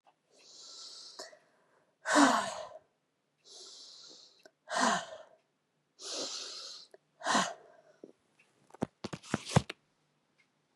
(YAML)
exhalation_length: 10.8 s
exhalation_amplitude: 9576
exhalation_signal_mean_std_ratio: 0.32
survey_phase: beta (2021-08-13 to 2022-03-07)
age: 45-64
gender: Female
wearing_mask: 'No'
symptom_cough_any: true
symptom_runny_or_blocked_nose: true
symptom_sore_throat: true
symptom_headache: true
symptom_onset: 2 days
smoker_status: Never smoked
respiratory_condition_asthma: false
respiratory_condition_other: false
recruitment_source: Test and Trace
submission_delay: 1 day
covid_test_result: Positive
covid_test_method: RT-qPCR
covid_ct_value: 22.2
covid_ct_gene: ORF1ab gene
covid_ct_mean: 22.5
covid_viral_load: 41000 copies/ml
covid_viral_load_category: Low viral load (10K-1M copies/ml)